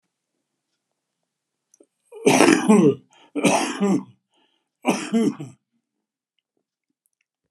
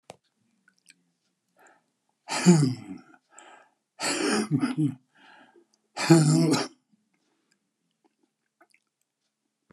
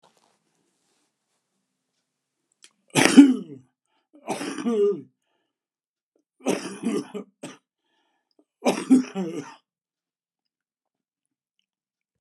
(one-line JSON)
{"cough_length": "7.5 s", "cough_amplitude": 32766, "cough_signal_mean_std_ratio": 0.37, "exhalation_length": "9.7 s", "exhalation_amplitude": 19237, "exhalation_signal_mean_std_ratio": 0.34, "three_cough_length": "12.2 s", "three_cough_amplitude": 32767, "three_cough_signal_mean_std_ratio": 0.26, "survey_phase": "beta (2021-08-13 to 2022-03-07)", "age": "65+", "gender": "Male", "wearing_mask": "No", "symptom_none": true, "smoker_status": "Never smoked", "respiratory_condition_asthma": false, "respiratory_condition_other": false, "recruitment_source": "REACT", "submission_delay": "2 days", "covid_test_result": "Negative", "covid_test_method": "RT-qPCR", "influenza_a_test_result": "Negative", "influenza_b_test_result": "Negative"}